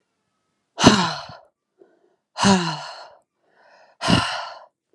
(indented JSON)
{
  "exhalation_length": "4.9 s",
  "exhalation_amplitude": 32767,
  "exhalation_signal_mean_std_ratio": 0.36,
  "survey_phase": "beta (2021-08-13 to 2022-03-07)",
  "age": "18-44",
  "gender": "Female",
  "wearing_mask": "No",
  "symptom_cough_any": true,
  "symptom_new_continuous_cough": true,
  "symptom_sore_throat": true,
  "symptom_change_to_sense_of_smell_or_taste": true,
  "symptom_loss_of_taste": true,
  "symptom_onset": "3 days",
  "smoker_status": "Never smoked",
  "respiratory_condition_asthma": false,
  "respiratory_condition_other": false,
  "recruitment_source": "Test and Trace",
  "submission_delay": "2 days",
  "covid_test_result": "Positive",
  "covid_test_method": "RT-qPCR",
  "covid_ct_value": 22.7,
  "covid_ct_gene": "ORF1ab gene",
  "covid_ct_mean": 23.2,
  "covid_viral_load": "24000 copies/ml",
  "covid_viral_load_category": "Low viral load (10K-1M copies/ml)"
}